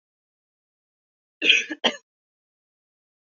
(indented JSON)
{
  "cough_length": "3.3 s",
  "cough_amplitude": 27964,
  "cough_signal_mean_std_ratio": 0.23,
  "survey_phase": "beta (2021-08-13 to 2022-03-07)",
  "age": "18-44",
  "gender": "Female",
  "wearing_mask": "No",
  "symptom_cough_any": true,
  "symptom_runny_or_blocked_nose": true,
  "symptom_sore_throat": true,
  "symptom_fatigue": true,
  "symptom_headache": true,
  "smoker_status": "Never smoked",
  "respiratory_condition_asthma": true,
  "respiratory_condition_other": false,
  "recruitment_source": "Test and Trace",
  "submission_delay": "1 day",
  "covid_test_result": "Positive",
  "covid_test_method": "ePCR"
}